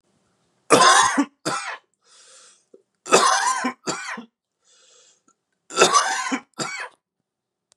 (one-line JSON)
{"three_cough_length": "7.8 s", "three_cough_amplitude": 32440, "three_cough_signal_mean_std_ratio": 0.41, "survey_phase": "beta (2021-08-13 to 2022-03-07)", "age": "18-44", "gender": "Male", "wearing_mask": "No", "symptom_cough_any": true, "symptom_runny_or_blocked_nose": true, "symptom_sore_throat": true, "symptom_fatigue": true, "symptom_headache": true, "smoker_status": "Ex-smoker", "respiratory_condition_asthma": false, "respiratory_condition_other": false, "recruitment_source": "Test and Trace", "submission_delay": "2 days", "covid_test_result": "Positive", "covid_test_method": "LFT"}